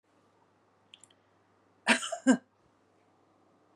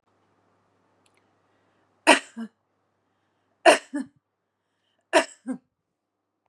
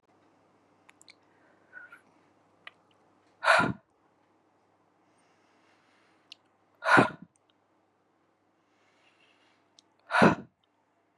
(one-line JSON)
{"cough_length": "3.8 s", "cough_amplitude": 9240, "cough_signal_mean_std_ratio": 0.22, "three_cough_length": "6.5 s", "three_cough_amplitude": 31447, "three_cough_signal_mean_std_ratio": 0.2, "exhalation_length": "11.2 s", "exhalation_amplitude": 14045, "exhalation_signal_mean_std_ratio": 0.21, "survey_phase": "beta (2021-08-13 to 2022-03-07)", "age": "45-64", "gender": "Female", "wearing_mask": "No", "symptom_none": true, "smoker_status": "Never smoked", "respiratory_condition_asthma": false, "respiratory_condition_other": false, "recruitment_source": "REACT", "submission_delay": "1 day", "covid_test_result": "Negative", "covid_test_method": "RT-qPCR", "influenza_a_test_result": "Negative", "influenza_b_test_result": "Negative"}